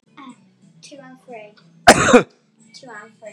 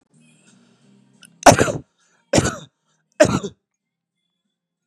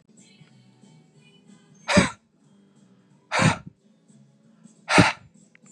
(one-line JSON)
{"cough_length": "3.3 s", "cough_amplitude": 32768, "cough_signal_mean_std_ratio": 0.27, "three_cough_length": "4.9 s", "three_cough_amplitude": 32768, "three_cough_signal_mean_std_ratio": 0.25, "exhalation_length": "5.7 s", "exhalation_amplitude": 25014, "exhalation_signal_mean_std_ratio": 0.28, "survey_phase": "beta (2021-08-13 to 2022-03-07)", "age": "18-44", "gender": "Male", "wearing_mask": "No", "symptom_cough_any": true, "symptom_onset": "5 days", "smoker_status": "Never smoked", "respiratory_condition_asthma": false, "respiratory_condition_other": false, "recruitment_source": "Test and Trace", "submission_delay": "1 day", "covid_test_result": "Positive", "covid_test_method": "RT-qPCR", "covid_ct_value": 22.3, "covid_ct_gene": "N gene"}